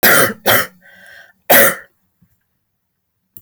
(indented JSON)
{
  "three_cough_length": "3.4 s",
  "three_cough_amplitude": 32768,
  "three_cough_signal_mean_std_ratio": 0.39,
  "survey_phase": "alpha (2021-03-01 to 2021-08-12)",
  "age": "45-64",
  "gender": "Female",
  "wearing_mask": "No",
  "symptom_none": true,
  "smoker_status": "Never smoked",
  "respiratory_condition_asthma": false,
  "respiratory_condition_other": false,
  "recruitment_source": "REACT",
  "submission_delay": "1 day",
  "covid_test_result": "Negative",
  "covid_test_method": "RT-qPCR"
}